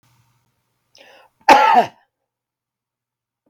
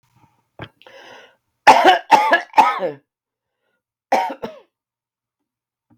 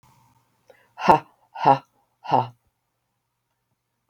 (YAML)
cough_length: 3.5 s
cough_amplitude: 32768
cough_signal_mean_std_ratio: 0.27
three_cough_length: 6.0 s
three_cough_amplitude: 32768
three_cough_signal_mean_std_ratio: 0.32
exhalation_length: 4.1 s
exhalation_amplitude: 32768
exhalation_signal_mean_std_ratio: 0.25
survey_phase: beta (2021-08-13 to 2022-03-07)
age: 65+
gender: Female
wearing_mask: 'No'
symptom_cough_any: true
symptom_fatigue: true
symptom_headache: true
symptom_onset: 12 days
smoker_status: Ex-smoker
respiratory_condition_asthma: false
respiratory_condition_other: false
recruitment_source: REACT
submission_delay: 2 days
covid_test_result: Negative
covid_test_method: RT-qPCR
influenza_a_test_result: Negative
influenza_b_test_result: Positive
influenza_b_ct_value: 34.0